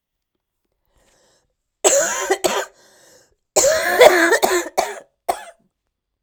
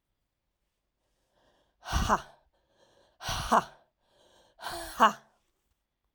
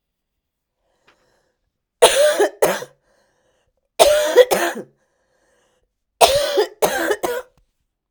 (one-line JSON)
{"cough_length": "6.2 s", "cough_amplitude": 32768, "cough_signal_mean_std_ratio": 0.42, "exhalation_length": "6.1 s", "exhalation_amplitude": 15314, "exhalation_signal_mean_std_ratio": 0.27, "three_cough_length": "8.1 s", "three_cough_amplitude": 32768, "three_cough_signal_mean_std_ratio": 0.4, "survey_phase": "alpha (2021-03-01 to 2021-08-12)", "age": "45-64", "gender": "Female", "wearing_mask": "No", "symptom_cough_any": true, "symptom_new_continuous_cough": true, "symptom_shortness_of_breath": true, "symptom_headache": true, "symptom_onset": "3 days", "smoker_status": "Ex-smoker", "respiratory_condition_asthma": false, "respiratory_condition_other": false, "recruitment_source": "Test and Trace", "submission_delay": "1 day", "covid_test_result": "Positive", "covid_test_method": "RT-qPCR", "covid_ct_value": 17.6, "covid_ct_gene": "ORF1ab gene", "covid_ct_mean": 18.0, "covid_viral_load": "1200000 copies/ml", "covid_viral_load_category": "High viral load (>1M copies/ml)"}